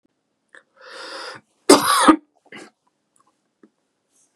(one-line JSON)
{"cough_length": "4.4 s", "cough_amplitude": 32768, "cough_signal_mean_std_ratio": 0.26, "survey_phase": "beta (2021-08-13 to 2022-03-07)", "age": "45-64", "gender": "Male", "wearing_mask": "No", "symptom_none": true, "smoker_status": "Ex-smoker", "respiratory_condition_asthma": false, "respiratory_condition_other": false, "recruitment_source": "REACT", "submission_delay": "7 days", "covid_test_result": "Negative", "covid_test_method": "RT-qPCR", "influenza_a_test_result": "Negative", "influenza_b_test_result": "Negative"}